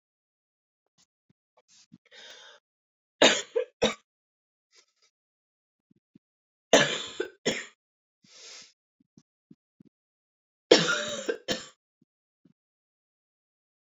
{"three_cough_length": "13.9 s", "three_cough_amplitude": 24224, "three_cough_signal_mean_std_ratio": 0.22, "survey_phase": "beta (2021-08-13 to 2022-03-07)", "age": "45-64", "gender": "Female", "wearing_mask": "No", "symptom_cough_any": true, "symptom_runny_or_blocked_nose": true, "symptom_fatigue": true, "symptom_headache": true, "symptom_change_to_sense_of_smell_or_taste": true, "smoker_status": "Never smoked", "respiratory_condition_asthma": false, "respiratory_condition_other": false, "recruitment_source": "Test and Trace", "submission_delay": "3 days", "covid_test_result": "Positive", "covid_test_method": "LFT"}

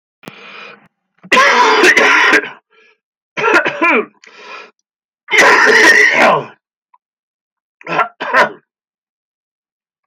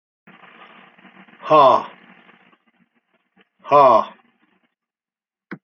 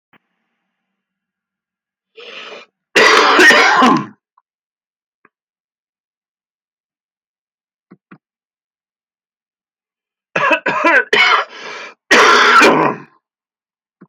{"three_cough_length": "10.1 s", "three_cough_amplitude": 32768, "three_cough_signal_mean_std_ratio": 0.51, "exhalation_length": "5.6 s", "exhalation_amplitude": 28210, "exhalation_signal_mean_std_ratio": 0.29, "cough_length": "14.1 s", "cough_amplitude": 32696, "cough_signal_mean_std_ratio": 0.38, "survey_phase": "beta (2021-08-13 to 2022-03-07)", "age": "65+", "gender": "Male", "wearing_mask": "No", "symptom_cough_any": true, "symptom_runny_or_blocked_nose": true, "symptom_shortness_of_breath": true, "symptom_fatigue": true, "symptom_fever_high_temperature": true, "symptom_loss_of_taste": true, "smoker_status": "Never smoked", "respiratory_condition_asthma": false, "respiratory_condition_other": false, "recruitment_source": "Test and Trace", "submission_delay": "1 day", "covid_test_result": "Positive", "covid_test_method": "LFT"}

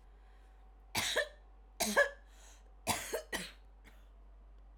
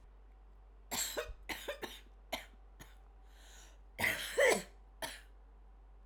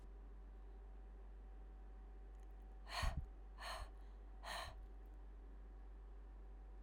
{"three_cough_length": "4.8 s", "three_cough_amplitude": 4765, "three_cough_signal_mean_std_ratio": 0.44, "cough_length": "6.1 s", "cough_amplitude": 4357, "cough_signal_mean_std_ratio": 0.44, "exhalation_length": "6.8 s", "exhalation_amplitude": 1260, "exhalation_signal_mean_std_ratio": 1.03, "survey_phase": "alpha (2021-03-01 to 2021-08-12)", "age": "18-44", "gender": "Female", "wearing_mask": "No", "symptom_none": true, "smoker_status": "Never smoked", "respiratory_condition_asthma": false, "respiratory_condition_other": false, "recruitment_source": "REACT", "submission_delay": "3 days", "covid_test_result": "Negative", "covid_test_method": "RT-qPCR"}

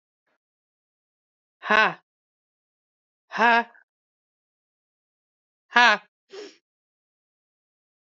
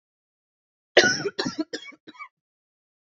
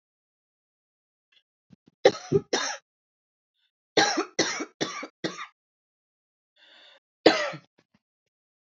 {"exhalation_length": "8.0 s", "exhalation_amplitude": 27440, "exhalation_signal_mean_std_ratio": 0.21, "cough_length": "3.1 s", "cough_amplitude": 26831, "cough_signal_mean_std_ratio": 0.28, "three_cough_length": "8.6 s", "three_cough_amplitude": 23771, "three_cough_signal_mean_std_ratio": 0.27, "survey_phase": "beta (2021-08-13 to 2022-03-07)", "age": "18-44", "gender": "Female", "wearing_mask": "No", "symptom_runny_or_blocked_nose": true, "symptom_shortness_of_breath": true, "symptom_fatigue": true, "symptom_headache": true, "symptom_onset": "12 days", "smoker_status": "Never smoked", "respiratory_condition_asthma": true, "respiratory_condition_other": false, "recruitment_source": "REACT", "submission_delay": "3 days", "covid_test_result": "Negative", "covid_test_method": "RT-qPCR", "influenza_a_test_result": "Negative", "influenza_b_test_result": "Negative"}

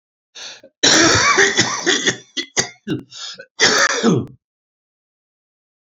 {"cough_length": "5.9 s", "cough_amplitude": 31229, "cough_signal_mean_std_ratio": 0.51, "survey_phase": "alpha (2021-03-01 to 2021-08-12)", "age": "65+", "gender": "Male", "wearing_mask": "No", "symptom_cough_any": true, "symptom_fatigue": true, "symptom_headache": true, "symptom_onset": "2 days", "smoker_status": "Ex-smoker", "respiratory_condition_asthma": false, "respiratory_condition_other": false, "recruitment_source": "Test and Trace", "submission_delay": "1 day", "covid_test_result": "Positive", "covid_test_method": "RT-qPCR", "covid_ct_value": 17.4, "covid_ct_gene": "ORF1ab gene", "covid_ct_mean": 18.3, "covid_viral_load": "1000000 copies/ml", "covid_viral_load_category": "High viral load (>1M copies/ml)"}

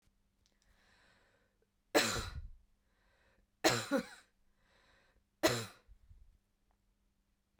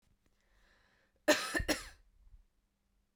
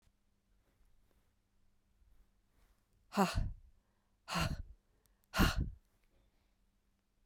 {"three_cough_length": "7.6 s", "three_cough_amplitude": 5741, "three_cough_signal_mean_std_ratio": 0.27, "cough_length": "3.2 s", "cough_amplitude": 6971, "cough_signal_mean_std_ratio": 0.28, "exhalation_length": "7.3 s", "exhalation_amplitude": 5471, "exhalation_signal_mean_std_ratio": 0.29, "survey_phase": "beta (2021-08-13 to 2022-03-07)", "age": "45-64", "gender": "Female", "wearing_mask": "No", "symptom_none": true, "smoker_status": "Ex-smoker", "respiratory_condition_asthma": false, "respiratory_condition_other": false, "recruitment_source": "REACT", "submission_delay": "1 day", "covid_test_result": "Negative", "covid_test_method": "RT-qPCR"}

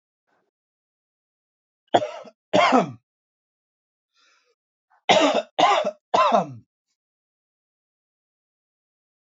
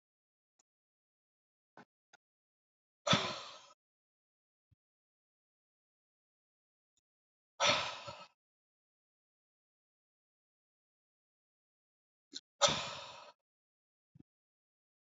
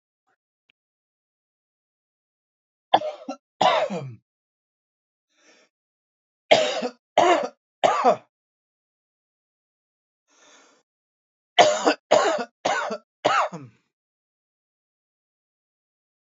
{"cough_length": "9.3 s", "cough_amplitude": 25680, "cough_signal_mean_std_ratio": 0.31, "exhalation_length": "15.1 s", "exhalation_amplitude": 6487, "exhalation_signal_mean_std_ratio": 0.19, "three_cough_length": "16.3 s", "three_cough_amplitude": 27797, "three_cough_signal_mean_std_ratio": 0.3, "survey_phase": "beta (2021-08-13 to 2022-03-07)", "age": "18-44", "gender": "Male", "wearing_mask": "No", "symptom_none": true, "smoker_status": "Current smoker (e-cigarettes or vapes only)", "respiratory_condition_asthma": false, "respiratory_condition_other": false, "recruitment_source": "REACT", "submission_delay": "4 days", "covid_test_result": "Negative", "covid_test_method": "RT-qPCR", "influenza_a_test_result": "Negative", "influenza_b_test_result": "Negative"}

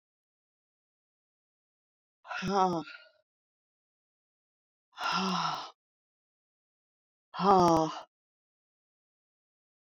{"exhalation_length": "9.9 s", "exhalation_amplitude": 9794, "exhalation_signal_mean_std_ratio": 0.29, "survey_phase": "beta (2021-08-13 to 2022-03-07)", "age": "65+", "gender": "Female", "wearing_mask": "No", "symptom_none": true, "smoker_status": "Ex-smoker", "respiratory_condition_asthma": false, "respiratory_condition_other": false, "recruitment_source": "REACT", "submission_delay": "9 days", "covid_test_result": "Negative", "covid_test_method": "RT-qPCR"}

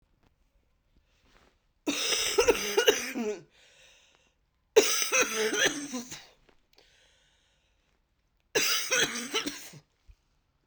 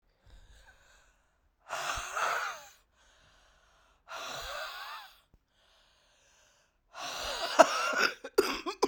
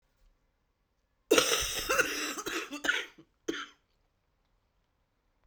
{"three_cough_length": "10.7 s", "three_cough_amplitude": 15606, "three_cough_signal_mean_std_ratio": 0.43, "exhalation_length": "8.9 s", "exhalation_amplitude": 20343, "exhalation_signal_mean_std_ratio": 0.36, "cough_length": "5.5 s", "cough_amplitude": 19195, "cough_signal_mean_std_ratio": 0.39, "survey_phase": "beta (2021-08-13 to 2022-03-07)", "age": "45-64", "gender": "Female", "wearing_mask": "No", "symptom_cough_any": true, "symptom_runny_or_blocked_nose": true, "symptom_shortness_of_breath": true, "symptom_fatigue": true, "symptom_headache": true, "symptom_change_to_sense_of_smell_or_taste": true, "symptom_loss_of_taste": true, "symptom_other": true, "symptom_onset": "5 days", "smoker_status": "Ex-smoker", "respiratory_condition_asthma": false, "respiratory_condition_other": false, "recruitment_source": "Test and Trace", "submission_delay": "2 days", "covid_test_result": "Positive", "covid_test_method": "RT-qPCR", "covid_ct_value": 14.7, "covid_ct_gene": "ORF1ab gene", "covid_ct_mean": 15.7, "covid_viral_load": "7100000 copies/ml", "covid_viral_load_category": "High viral load (>1M copies/ml)"}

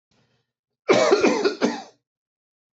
{"cough_length": "2.7 s", "cough_amplitude": 23080, "cough_signal_mean_std_ratio": 0.44, "survey_phase": "beta (2021-08-13 to 2022-03-07)", "age": "45-64", "gender": "Male", "wearing_mask": "No", "symptom_none": true, "smoker_status": "Ex-smoker", "respiratory_condition_asthma": false, "respiratory_condition_other": false, "recruitment_source": "REACT", "submission_delay": "3 days", "covid_test_result": "Negative", "covid_test_method": "RT-qPCR"}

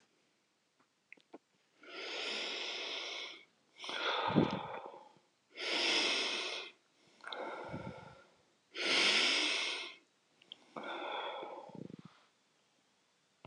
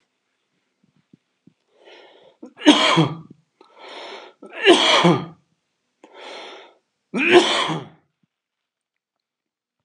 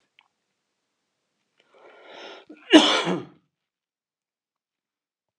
{"exhalation_length": "13.5 s", "exhalation_amplitude": 5695, "exhalation_signal_mean_std_ratio": 0.53, "three_cough_length": "9.8 s", "three_cough_amplitude": 32280, "three_cough_signal_mean_std_ratio": 0.34, "cough_length": "5.4 s", "cough_amplitude": 32523, "cough_signal_mean_std_ratio": 0.21, "survey_phase": "beta (2021-08-13 to 2022-03-07)", "age": "45-64", "gender": "Male", "wearing_mask": "No", "symptom_none": true, "smoker_status": "Ex-smoker", "respiratory_condition_asthma": false, "respiratory_condition_other": false, "recruitment_source": "Test and Trace", "submission_delay": "2 days", "covid_test_result": "Negative", "covid_test_method": "LFT"}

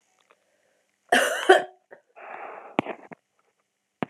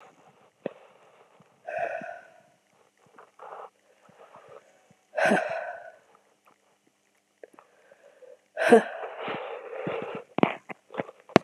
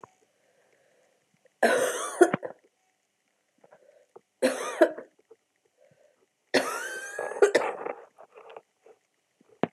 {"cough_length": "4.1 s", "cough_amplitude": 29565, "cough_signal_mean_std_ratio": 0.27, "exhalation_length": "11.4 s", "exhalation_amplitude": 32767, "exhalation_signal_mean_std_ratio": 0.29, "three_cough_length": "9.7 s", "three_cough_amplitude": 21212, "three_cough_signal_mean_std_ratio": 0.32, "survey_phase": "beta (2021-08-13 to 2022-03-07)", "age": "18-44", "gender": "Female", "wearing_mask": "No", "symptom_cough_any": true, "symptom_runny_or_blocked_nose": true, "symptom_sore_throat": true, "symptom_fatigue": true, "symptom_fever_high_temperature": true, "symptom_headache": true, "symptom_onset": "3 days", "smoker_status": "Never smoked", "respiratory_condition_asthma": false, "respiratory_condition_other": false, "recruitment_source": "Test and Trace", "submission_delay": "2 days", "covid_test_result": "Positive", "covid_test_method": "RT-qPCR", "covid_ct_value": 24.2, "covid_ct_gene": "ORF1ab gene"}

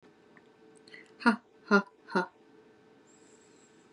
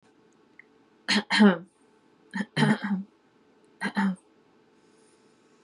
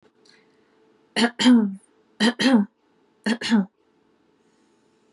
{"exhalation_length": "3.9 s", "exhalation_amplitude": 12660, "exhalation_signal_mean_std_ratio": 0.25, "cough_length": "5.6 s", "cough_amplitude": 15455, "cough_signal_mean_std_ratio": 0.35, "three_cough_length": "5.1 s", "three_cough_amplitude": 17743, "three_cough_signal_mean_std_ratio": 0.39, "survey_phase": "beta (2021-08-13 to 2022-03-07)", "age": "18-44", "gender": "Female", "wearing_mask": "No", "symptom_none": true, "smoker_status": "Never smoked", "respiratory_condition_asthma": false, "respiratory_condition_other": false, "recruitment_source": "REACT", "submission_delay": "3 days", "covid_test_result": "Negative", "covid_test_method": "RT-qPCR", "influenza_a_test_result": "Negative", "influenza_b_test_result": "Negative"}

